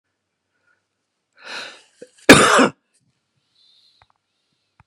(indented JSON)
{
  "cough_length": "4.9 s",
  "cough_amplitude": 32768,
  "cough_signal_mean_std_ratio": 0.23,
  "survey_phase": "beta (2021-08-13 to 2022-03-07)",
  "age": "45-64",
  "gender": "Male",
  "wearing_mask": "No",
  "symptom_cough_any": true,
  "smoker_status": "Never smoked",
  "respiratory_condition_asthma": false,
  "respiratory_condition_other": false,
  "recruitment_source": "REACT",
  "submission_delay": "1 day",
  "covid_test_result": "Negative",
  "covid_test_method": "RT-qPCR"
}